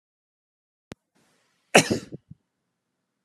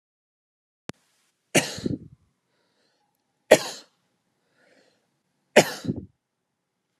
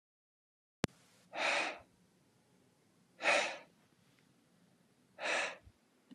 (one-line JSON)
{"cough_length": "3.2 s", "cough_amplitude": 32139, "cough_signal_mean_std_ratio": 0.17, "three_cough_length": "7.0 s", "three_cough_amplitude": 32767, "three_cough_signal_mean_std_ratio": 0.18, "exhalation_length": "6.1 s", "exhalation_amplitude": 7559, "exhalation_signal_mean_std_ratio": 0.34, "survey_phase": "alpha (2021-03-01 to 2021-08-12)", "age": "18-44", "gender": "Male", "wearing_mask": "No", "symptom_none": true, "symptom_onset": "8 days", "smoker_status": "Ex-smoker", "respiratory_condition_asthma": false, "respiratory_condition_other": false, "recruitment_source": "REACT", "submission_delay": "3 days", "covid_test_result": "Negative", "covid_test_method": "RT-qPCR"}